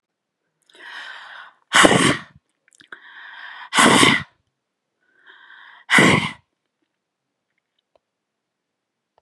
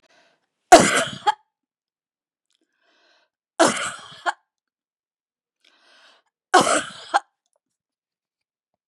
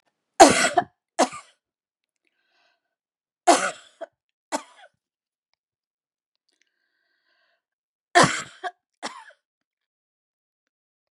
{"exhalation_length": "9.2 s", "exhalation_amplitude": 32768, "exhalation_signal_mean_std_ratio": 0.31, "three_cough_length": "8.9 s", "three_cough_amplitude": 32768, "three_cough_signal_mean_std_ratio": 0.24, "cough_length": "11.2 s", "cough_amplitude": 32768, "cough_signal_mean_std_ratio": 0.2, "survey_phase": "beta (2021-08-13 to 2022-03-07)", "age": "65+", "gender": "Female", "wearing_mask": "No", "symptom_fatigue": true, "symptom_change_to_sense_of_smell_or_taste": true, "symptom_onset": "12 days", "smoker_status": "Never smoked", "respiratory_condition_asthma": false, "respiratory_condition_other": false, "recruitment_source": "REACT", "submission_delay": "2 days", "covid_test_result": "Negative", "covid_test_method": "RT-qPCR", "influenza_a_test_result": "Negative", "influenza_b_test_result": "Negative"}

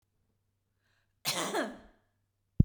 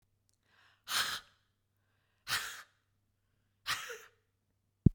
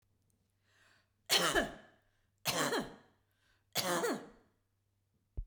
{"cough_length": "2.6 s", "cough_amplitude": 14297, "cough_signal_mean_std_ratio": 0.25, "exhalation_length": "4.9 s", "exhalation_amplitude": 14147, "exhalation_signal_mean_std_ratio": 0.23, "three_cough_length": "5.5 s", "three_cough_amplitude": 5705, "three_cough_signal_mean_std_ratio": 0.39, "survey_phase": "beta (2021-08-13 to 2022-03-07)", "age": "65+", "gender": "Female", "wearing_mask": "No", "symptom_none": true, "smoker_status": "Ex-smoker", "respiratory_condition_asthma": false, "respiratory_condition_other": false, "recruitment_source": "REACT", "submission_delay": "2 days", "covid_test_result": "Negative", "covid_test_method": "RT-qPCR"}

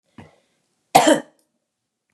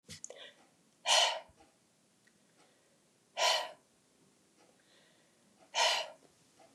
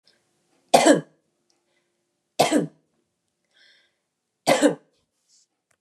{"cough_length": "2.1 s", "cough_amplitude": 32768, "cough_signal_mean_std_ratio": 0.25, "exhalation_length": "6.7 s", "exhalation_amplitude": 7078, "exhalation_signal_mean_std_ratio": 0.32, "three_cough_length": "5.8 s", "three_cough_amplitude": 30714, "three_cough_signal_mean_std_ratio": 0.27, "survey_phase": "beta (2021-08-13 to 2022-03-07)", "age": "45-64", "gender": "Female", "wearing_mask": "No", "symptom_none": true, "smoker_status": "Never smoked", "respiratory_condition_asthma": false, "respiratory_condition_other": false, "recruitment_source": "REACT", "submission_delay": "2 days", "covid_test_result": "Negative", "covid_test_method": "RT-qPCR", "influenza_a_test_result": "Negative", "influenza_b_test_result": "Negative"}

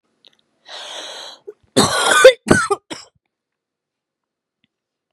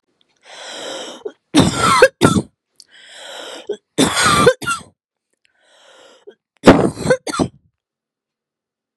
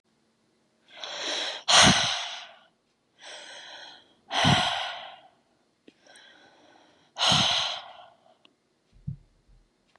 {"cough_length": "5.1 s", "cough_amplitude": 32768, "cough_signal_mean_std_ratio": 0.31, "three_cough_length": "9.0 s", "three_cough_amplitude": 32768, "three_cough_signal_mean_std_ratio": 0.38, "exhalation_length": "10.0 s", "exhalation_amplitude": 21311, "exhalation_signal_mean_std_ratio": 0.38, "survey_phase": "beta (2021-08-13 to 2022-03-07)", "age": "18-44", "gender": "Female", "wearing_mask": "No", "symptom_none": true, "smoker_status": "Never smoked", "respiratory_condition_asthma": false, "respiratory_condition_other": false, "recruitment_source": "REACT", "submission_delay": "1 day", "covid_test_result": "Negative", "covid_test_method": "RT-qPCR", "influenza_a_test_result": "Negative", "influenza_b_test_result": "Negative"}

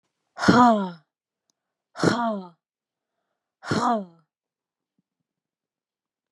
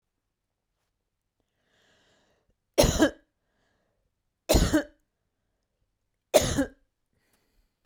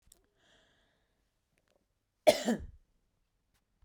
{"exhalation_length": "6.3 s", "exhalation_amplitude": 22852, "exhalation_signal_mean_std_ratio": 0.31, "three_cough_length": "7.9 s", "three_cough_amplitude": 18733, "three_cough_signal_mean_std_ratio": 0.25, "cough_length": "3.8 s", "cough_amplitude": 10983, "cough_signal_mean_std_ratio": 0.18, "survey_phase": "beta (2021-08-13 to 2022-03-07)", "age": "45-64", "gender": "Female", "wearing_mask": "No", "symptom_none": true, "smoker_status": "Ex-smoker", "respiratory_condition_asthma": false, "respiratory_condition_other": false, "recruitment_source": "Test and Trace", "submission_delay": "3 days", "covid_test_result": "Positive", "covid_test_method": "RT-qPCR", "covid_ct_value": 28.6, "covid_ct_gene": "ORF1ab gene"}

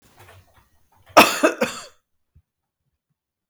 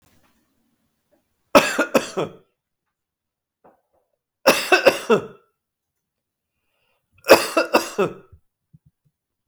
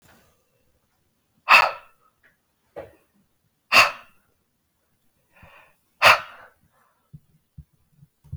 {"cough_length": "3.5 s", "cough_amplitude": 32768, "cough_signal_mean_std_ratio": 0.24, "three_cough_length": "9.5 s", "three_cough_amplitude": 32766, "three_cough_signal_mean_std_ratio": 0.28, "exhalation_length": "8.4 s", "exhalation_amplitude": 32542, "exhalation_signal_mean_std_ratio": 0.21, "survey_phase": "beta (2021-08-13 to 2022-03-07)", "age": "45-64", "gender": "Male", "wearing_mask": "No", "symptom_none": true, "smoker_status": "Never smoked", "respiratory_condition_asthma": false, "respiratory_condition_other": false, "recruitment_source": "REACT", "submission_delay": "1 day", "covid_test_result": "Negative", "covid_test_method": "RT-qPCR", "influenza_a_test_result": "Negative", "influenza_b_test_result": "Negative"}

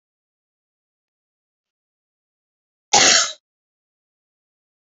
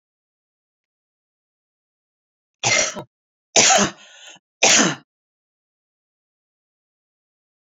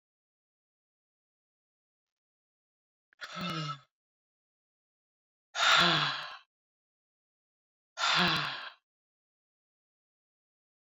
{"cough_length": "4.9 s", "cough_amplitude": 29722, "cough_signal_mean_std_ratio": 0.21, "three_cough_length": "7.7 s", "three_cough_amplitude": 28468, "three_cough_signal_mean_std_ratio": 0.28, "exhalation_length": "10.9 s", "exhalation_amplitude": 9207, "exhalation_signal_mean_std_ratio": 0.29, "survey_phase": "beta (2021-08-13 to 2022-03-07)", "age": "65+", "gender": "Female", "wearing_mask": "No", "symptom_none": true, "smoker_status": "Never smoked", "respiratory_condition_asthma": false, "respiratory_condition_other": false, "recruitment_source": "REACT", "submission_delay": "0 days", "covid_test_result": "Negative", "covid_test_method": "RT-qPCR"}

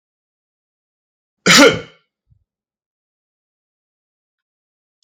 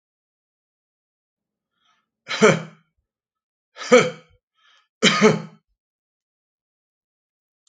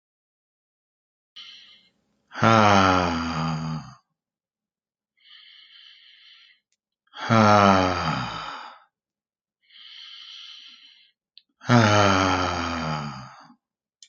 {"cough_length": "5.0 s", "cough_amplitude": 32768, "cough_signal_mean_std_ratio": 0.2, "three_cough_length": "7.7 s", "three_cough_amplitude": 28926, "three_cough_signal_mean_std_ratio": 0.24, "exhalation_length": "14.1 s", "exhalation_amplitude": 32768, "exhalation_signal_mean_std_ratio": 0.39, "survey_phase": "alpha (2021-03-01 to 2021-08-12)", "age": "45-64", "gender": "Male", "wearing_mask": "No", "symptom_none": true, "symptom_onset": "2 days", "smoker_status": "Ex-smoker", "respiratory_condition_asthma": false, "respiratory_condition_other": false, "recruitment_source": "REACT", "submission_delay": "2 days", "covid_test_result": "Negative", "covid_test_method": "RT-qPCR"}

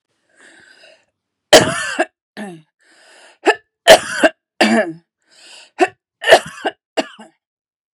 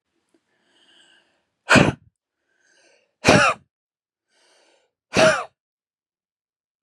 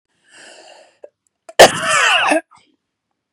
{"three_cough_length": "7.9 s", "three_cough_amplitude": 32768, "three_cough_signal_mean_std_ratio": 0.31, "exhalation_length": "6.8 s", "exhalation_amplitude": 31420, "exhalation_signal_mean_std_ratio": 0.26, "cough_length": "3.3 s", "cough_amplitude": 32768, "cough_signal_mean_std_ratio": 0.35, "survey_phase": "beta (2021-08-13 to 2022-03-07)", "age": "45-64", "gender": "Female", "wearing_mask": "No", "symptom_diarrhoea": true, "smoker_status": "Never smoked", "respiratory_condition_asthma": false, "respiratory_condition_other": false, "recruitment_source": "REACT", "submission_delay": "2 days", "covid_test_result": "Negative", "covid_test_method": "RT-qPCR", "influenza_a_test_result": "Negative", "influenza_b_test_result": "Negative"}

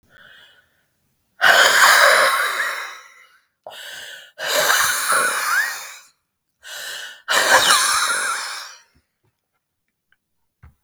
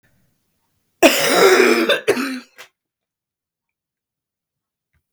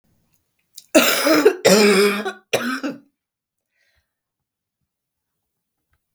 {"exhalation_length": "10.8 s", "exhalation_amplitude": 32768, "exhalation_signal_mean_std_ratio": 0.52, "cough_length": "5.1 s", "cough_amplitude": 32768, "cough_signal_mean_std_ratio": 0.38, "three_cough_length": "6.1 s", "three_cough_amplitude": 32768, "three_cough_signal_mean_std_ratio": 0.39, "survey_phase": "beta (2021-08-13 to 2022-03-07)", "age": "45-64", "gender": "Female", "wearing_mask": "No", "symptom_cough_any": true, "symptom_runny_or_blocked_nose": true, "symptom_sore_throat": true, "symptom_fatigue": true, "symptom_fever_high_temperature": true, "symptom_change_to_sense_of_smell_or_taste": true, "symptom_loss_of_taste": true, "symptom_onset": "2 days", "smoker_status": "Ex-smoker", "respiratory_condition_asthma": false, "respiratory_condition_other": false, "recruitment_source": "Test and Trace", "submission_delay": "1 day", "covid_test_result": "Positive", "covid_test_method": "RT-qPCR", "covid_ct_value": 19.2, "covid_ct_gene": "ORF1ab gene", "covid_ct_mean": 19.8, "covid_viral_load": "320000 copies/ml", "covid_viral_load_category": "Low viral load (10K-1M copies/ml)"}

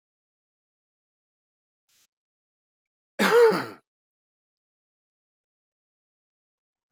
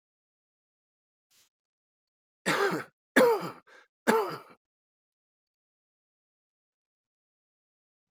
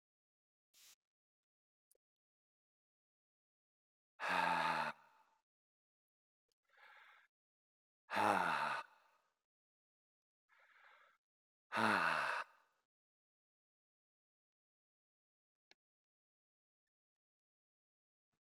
{"cough_length": "6.9 s", "cough_amplitude": 13533, "cough_signal_mean_std_ratio": 0.2, "three_cough_length": "8.1 s", "three_cough_amplitude": 15878, "three_cough_signal_mean_std_ratio": 0.25, "exhalation_length": "18.5 s", "exhalation_amplitude": 3788, "exhalation_signal_mean_std_ratio": 0.27, "survey_phase": "beta (2021-08-13 to 2022-03-07)", "age": "45-64", "gender": "Male", "wearing_mask": "No", "symptom_none": true, "symptom_onset": "12 days", "smoker_status": "Ex-smoker", "respiratory_condition_asthma": false, "respiratory_condition_other": false, "recruitment_source": "REACT", "submission_delay": "2 days", "covid_test_result": "Negative", "covid_test_method": "RT-qPCR", "influenza_a_test_result": "Negative", "influenza_b_test_result": "Negative"}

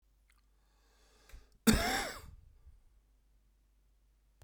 {"cough_length": "4.4 s", "cough_amplitude": 8589, "cough_signal_mean_std_ratio": 0.26, "survey_phase": "beta (2021-08-13 to 2022-03-07)", "age": "65+", "gender": "Male", "wearing_mask": "No", "symptom_cough_any": true, "symptom_runny_or_blocked_nose": true, "symptom_onset": "9 days", "smoker_status": "Ex-smoker", "respiratory_condition_asthma": false, "respiratory_condition_other": true, "recruitment_source": "REACT", "submission_delay": "2 days", "covid_test_result": "Negative", "covid_test_method": "RT-qPCR"}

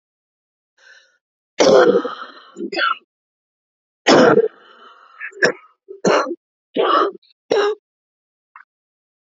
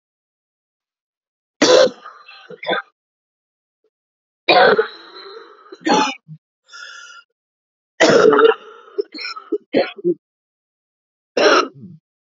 {"cough_length": "9.3 s", "cough_amplitude": 31550, "cough_signal_mean_std_ratio": 0.39, "three_cough_length": "12.3 s", "three_cough_amplitude": 31936, "three_cough_signal_mean_std_ratio": 0.36, "survey_phase": "alpha (2021-03-01 to 2021-08-12)", "age": "45-64", "gender": "Female", "wearing_mask": "No", "symptom_cough_any": true, "symptom_new_continuous_cough": true, "symptom_shortness_of_breath": true, "symptom_abdominal_pain": true, "symptom_diarrhoea": true, "symptom_fatigue": true, "symptom_fever_high_temperature": true, "symptom_headache": true, "symptom_change_to_sense_of_smell_or_taste": true, "symptom_loss_of_taste": true, "symptom_onset": "4 days", "smoker_status": "Ex-smoker", "respiratory_condition_asthma": false, "respiratory_condition_other": false, "recruitment_source": "Test and Trace", "submission_delay": "1 day", "covid_test_result": "Positive", "covid_test_method": "RT-qPCR", "covid_ct_value": 11.2, "covid_ct_gene": "ORF1ab gene", "covid_ct_mean": 11.5, "covid_viral_load": "170000000 copies/ml", "covid_viral_load_category": "High viral load (>1M copies/ml)"}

